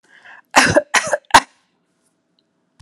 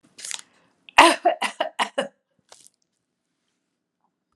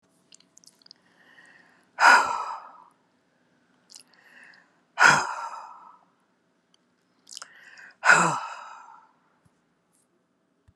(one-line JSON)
{"cough_length": "2.8 s", "cough_amplitude": 32768, "cough_signal_mean_std_ratio": 0.3, "three_cough_length": "4.4 s", "three_cough_amplitude": 32768, "three_cough_signal_mean_std_ratio": 0.25, "exhalation_length": "10.8 s", "exhalation_amplitude": 25266, "exhalation_signal_mean_std_ratio": 0.26, "survey_phase": "alpha (2021-03-01 to 2021-08-12)", "age": "65+", "gender": "Female", "wearing_mask": "No", "symptom_none": true, "smoker_status": "Ex-smoker", "respiratory_condition_asthma": false, "respiratory_condition_other": false, "recruitment_source": "REACT", "submission_delay": "1 day", "covid_test_result": "Negative", "covid_test_method": "RT-qPCR"}